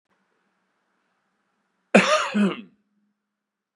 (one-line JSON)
{"cough_length": "3.8 s", "cough_amplitude": 31830, "cough_signal_mean_std_ratio": 0.29, "survey_phase": "beta (2021-08-13 to 2022-03-07)", "age": "45-64", "gender": "Male", "wearing_mask": "No", "symptom_runny_or_blocked_nose": true, "smoker_status": "Never smoked", "respiratory_condition_asthma": false, "respiratory_condition_other": false, "recruitment_source": "REACT", "submission_delay": "4 days", "covid_test_result": "Negative", "covid_test_method": "RT-qPCR", "influenza_a_test_result": "Negative", "influenza_b_test_result": "Negative"}